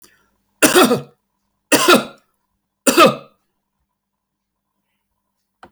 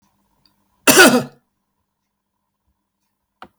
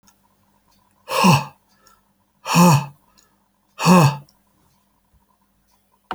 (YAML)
three_cough_length: 5.7 s
three_cough_amplitude: 32768
three_cough_signal_mean_std_ratio: 0.31
cough_length: 3.6 s
cough_amplitude: 32768
cough_signal_mean_std_ratio: 0.25
exhalation_length: 6.1 s
exhalation_amplitude: 30163
exhalation_signal_mean_std_ratio: 0.33
survey_phase: beta (2021-08-13 to 2022-03-07)
age: 65+
gender: Male
wearing_mask: 'No'
symptom_none: true
smoker_status: Never smoked
respiratory_condition_asthma: false
respiratory_condition_other: false
recruitment_source: REACT
submission_delay: 8 days
covid_test_result: Negative
covid_test_method: RT-qPCR